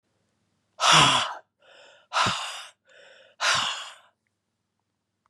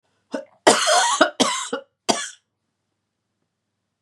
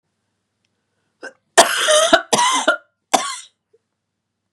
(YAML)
exhalation_length: 5.3 s
exhalation_amplitude: 19238
exhalation_signal_mean_std_ratio: 0.38
cough_length: 4.0 s
cough_amplitude: 32686
cough_signal_mean_std_ratio: 0.39
three_cough_length: 4.5 s
three_cough_amplitude: 32768
three_cough_signal_mean_std_ratio: 0.39
survey_phase: beta (2021-08-13 to 2022-03-07)
age: 65+
gender: Female
wearing_mask: 'No'
symptom_cough_any: true
symptom_runny_or_blocked_nose: true
symptom_sore_throat: true
symptom_abdominal_pain: true
symptom_fatigue: true
symptom_headache: true
symptom_onset: 2 days
smoker_status: Never smoked
respiratory_condition_asthma: false
respiratory_condition_other: false
recruitment_source: Test and Trace
submission_delay: 2 days
covid_test_result: Positive
covid_test_method: RT-qPCR
covid_ct_value: 14.7
covid_ct_gene: ORF1ab gene
covid_ct_mean: 15.8
covid_viral_load: 6700000 copies/ml
covid_viral_load_category: High viral load (>1M copies/ml)